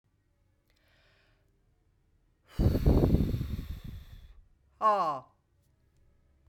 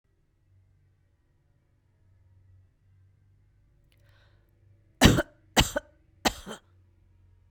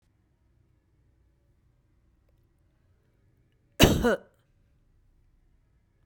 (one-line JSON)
{"exhalation_length": "6.5 s", "exhalation_amplitude": 11004, "exhalation_signal_mean_std_ratio": 0.39, "three_cough_length": "7.5 s", "three_cough_amplitude": 25167, "three_cough_signal_mean_std_ratio": 0.19, "cough_length": "6.1 s", "cough_amplitude": 26090, "cough_signal_mean_std_ratio": 0.19, "survey_phase": "beta (2021-08-13 to 2022-03-07)", "age": "65+", "gender": "Female", "wearing_mask": "No", "symptom_none": true, "smoker_status": "Never smoked", "respiratory_condition_asthma": false, "respiratory_condition_other": false, "recruitment_source": "REACT", "submission_delay": "3 days", "covid_test_result": "Negative", "covid_test_method": "RT-qPCR"}